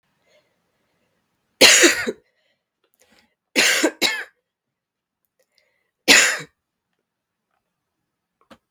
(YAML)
three_cough_length: 8.7 s
three_cough_amplitude: 32768
three_cough_signal_mean_std_ratio: 0.28
survey_phase: beta (2021-08-13 to 2022-03-07)
age: 18-44
gender: Female
wearing_mask: 'No'
symptom_cough_any: true
symptom_runny_or_blocked_nose: true
symptom_shortness_of_breath: true
symptom_fatigue: true
symptom_headache: true
symptom_change_to_sense_of_smell_or_taste: true
symptom_loss_of_taste: true
symptom_onset: 3 days
smoker_status: Never smoked
respiratory_condition_asthma: false
respiratory_condition_other: false
recruitment_source: Test and Trace
submission_delay: 1 day
covid_test_result: Positive
covid_test_method: ePCR